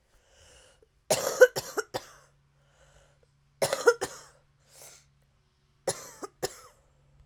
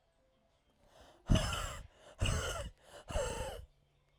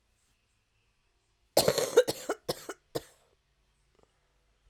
{"three_cough_length": "7.3 s", "three_cough_amplitude": 17694, "three_cough_signal_mean_std_ratio": 0.24, "exhalation_length": "4.2 s", "exhalation_amplitude": 5089, "exhalation_signal_mean_std_ratio": 0.46, "cough_length": "4.7 s", "cough_amplitude": 11544, "cough_signal_mean_std_ratio": 0.25, "survey_phase": "beta (2021-08-13 to 2022-03-07)", "age": "18-44", "gender": "Female", "wearing_mask": "No", "symptom_cough_any": true, "symptom_runny_or_blocked_nose": true, "symptom_shortness_of_breath": true, "symptom_sore_throat": true, "symptom_fatigue": true, "symptom_headache": true, "symptom_change_to_sense_of_smell_or_taste": true, "symptom_loss_of_taste": true, "smoker_status": "Current smoker (1 to 10 cigarettes per day)", "respiratory_condition_asthma": false, "respiratory_condition_other": false, "recruitment_source": "Test and Trace", "submission_delay": "1 day", "covid_test_result": "Positive", "covid_test_method": "RT-qPCR", "covid_ct_value": 23.5, "covid_ct_gene": "ORF1ab gene"}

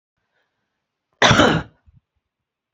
{"cough_length": "2.7 s", "cough_amplitude": 32767, "cough_signal_mean_std_ratio": 0.29, "survey_phase": "alpha (2021-03-01 to 2021-08-12)", "age": "45-64", "gender": "Female", "wearing_mask": "No", "symptom_none": true, "smoker_status": "Ex-smoker", "respiratory_condition_asthma": false, "respiratory_condition_other": false, "recruitment_source": "REACT", "submission_delay": "2 days", "covid_test_result": "Negative", "covid_test_method": "RT-qPCR"}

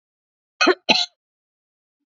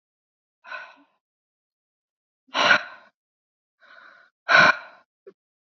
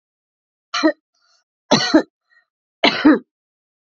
{"cough_length": "2.1 s", "cough_amplitude": 27604, "cough_signal_mean_std_ratio": 0.28, "exhalation_length": "5.7 s", "exhalation_amplitude": 24842, "exhalation_signal_mean_std_ratio": 0.25, "three_cough_length": "3.9 s", "three_cough_amplitude": 30198, "three_cough_signal_mean_std_ratio": 0.33, "survey_phase": "beta (2021-08-13 to 2022-03-07)", "age": "18-44", "gender": "Female", "wearing_mask": "No", "symptom_none": true, "smoker_status": "Ex-smoker", "respiratory_condition_asthma": false, "respiratory_condition_other": false, "recruitment_source": "REACT", "submission_delay": "3 days", "covid_test_result": "Positive", "covid_test_method": "RT-qPCR", "covid_ct_value": 35.9, "covid_ct_gene": "E gene", "influenza_a_test_result": "Negative", "influenza_b_test_result": "Negative"}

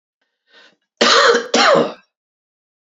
{"cough_length": "3.0 s", "cough_amplitude": 32544, "cough_signal_mean_std_ratio": 0.44, "survey_phase": "beta (2021-08-13 to 2022-03-07)", "age": "18-44", "gender": "Male", "wearing_mask": "No", "symptom_cough_any": true, "symptom_runny_or_blocked_nose": true, "symptom_fatigue": true, "symptom_headache": true, "smoker_status": "Never smoked", "respiratory_condition_asthma": false, "respiratory_condition_other": false, "recruitment_source": "Test and Trace", "submission_delay": "2 days", "covid_test_result": "Positive", "covid_test_method": "RT-qPCR"}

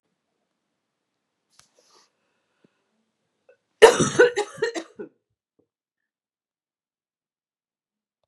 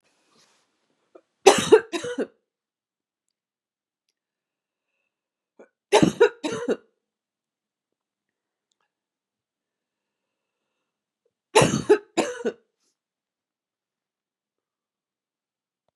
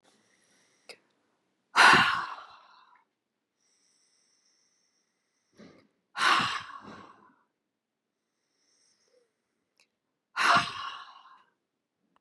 {"cough_length": "8.3 s", "cough_amplitude": 32767, "cough_signal_mean_std_ratio": 0.18, "three_cough_length": "16.0 s", "three_cough_amplitude": 32767, "three_cough_signal_mean_std_ratio": 0.21, "exhalation_length": "12.2 s", "exhalation_amplitude": 16378, "exhalation_signal_mean_std_ratio": 0.25, "survey_phase": "beta (2021-08-13 to 2022-03-07)", "age": "65+", "gender": "Female", "wearing_mask": "No", "symptom_new_continuous_cough": true, "symptom_runny_or_blocked_nose": true, "symptom_sore_throat": true, "symptom_fatigue": true, "symptom_onset": "2 days", "smoker_status": "Never smoked", "respiratory_condition_asthma": false, "respiratory_condition_other": false, "recruitment_source": "Test and Trace", "submission_delay": "1 day", "covid_test_result": "Negative", "covid_test_method": "RT-qPCR"}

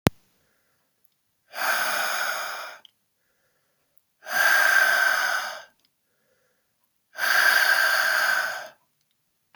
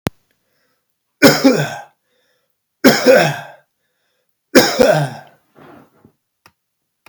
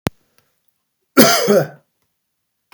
{"exhalation_length": "9.6 s", "exhalation_amplitude": 26525, "exhalation_signal_mean_std_ratio": 0.53, "three_cough_length": "7.1 s", "three_cough_amplitude": 32768, "three_cough_signal_mean_std_ratio": 0.35, "cough_length": "2.7 s", "cough_amplitude": 32768, "cough_signal_mean_std_ratio": 0.33, "survey_phase": "beta (2021-08-13 to 2022-03-07)", "age": "45-64", "gender": "Male", "wearing_mask": "No", "symptom_none": true, "smoker_status": "Never smoked", "respiratory_condition_asthma": false, "respiratory_condition_other": false, "recruitment_source": "REACT", "submission_delay": "2 days", "covid_test_result": "Negative", "covid_test_method": "RT-qPCR"}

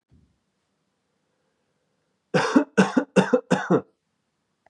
{"three_cough_length": "4.7 s", "three_cough_amplitude": 22732, "three_cough_signal_mean_std_ratio": 0.33, "survey_phase": "beta (2021-08-13 to 2022-03-07)", "age": "18-44", "gender": "Male", "wearing_mask": "No", "symptom_runny_or_blocked_nose": true, "symptom_fatigue": true, "symptom_headache": true, "symptom_change_to_sense_of_smell_or_taste": true, "symptom_loss_of_taste": true, "symptom_other": true, "symptom_onset": "4 days", "smoker_status": "Never smoked", "respiratory_condition_asthma": false, "respiratory_condition_other": false, "recruitment_source": "Test and Trace", "submission_delay": "1 day", "covid_test_result": "Positive", "covid_test_method": "RT-qPCR", "covid_ct_value": 27.4, "covid_ct_gene": "N gene"}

